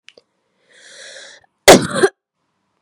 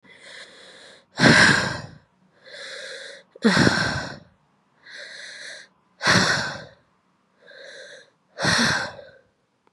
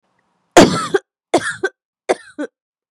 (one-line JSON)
{"cough_length": "2.8 s", "cough_amplitude": 32768, "cough_signal_mean_std_ratio": 0.25, "exhalation_length": "9.7 s", "exhalation_amplitude": 28469, "exhalation_signal_mean_std_ratio": 0.41, "three_cough_length": "2.9 s", "three_cough_amplitude": 32768, "three_cough_signal_mean_std_ratio": 0.32, "survey_phase": "beta (2021-08-13 to 2022-03-07)", "age": "18-44", "gender": "Female", "wearing_mask": "Yes", "symptom_runny_or_blocked_nose": true, "symptom_shortness_of_breath": true, "symptom_fatigue": true, "symptom_headache": true, "symptom_onset": "8 days", "smoker_status": "Current smoker (e-cigarettes or vapes only)", "respiratory_condition_asthma": true, "respiratory_condition_other": false, "recruitment_source": "Test and Trace", "submission_delay": "2 days", "covid_test_result": "Positive", "covid_test_method": "RT-qPCR", "covid_ct_value": 27.7, "covid_ct_gene": "N gene"}